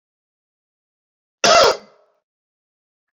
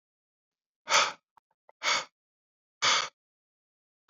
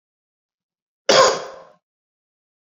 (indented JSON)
{
  "cough_length": "3.2 s",
  "cough_amplitude": 29990,
  "cough_signal_mean_std_ratio": 0.26,
  "exhalation_length": "4.1 s",
  "exhalation_amplitude": 10431,
  "exhalation_signal_mean_std_ratio": 0.31,
  "three_cough_length": "2.6 s",
  "three_cough_amplitude": 27517,
  "three_cough_signal_mean_std_ratio": 0.27,
  "survey_phase": "beta (2021-08-13 to 2022-03-07)",
  "age": "18-44",
  "gender": "Male",
  "wearing_mask": "No",
  "symptom_none": true,
  "smoker_status": "Never smoked",
  "respiratory_condition_asthma": false,
  "respiratory_condition_other": false,
  "recruitment_source": "REACT",
  "submission_delay": "2 days",
  "covid_test_result": "Negative",
  "covid_test_method": "RT-qPCR"
}